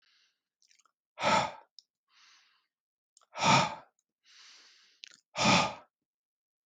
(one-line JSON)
{"exhalation_length": "6.7 s", "exhalation_amplitude": 8351, "exhalation_signal_mean_std_ratio": 0.31, "survey_phase": "beta (2021-08-13 to 2022-03-07)", "age": "45-64", "gender": "Male", "wearing_mask": "No", "symptom_none": true, "smoker_status": "Never smoked", "respiratory_condition_asthma": false, "respiratory_condition_other": false, "recruitment_source": "REACT", "submission_delay": "1 day", "covid_test_result": "Negative", "covid_test_method": "RT-qPCR"}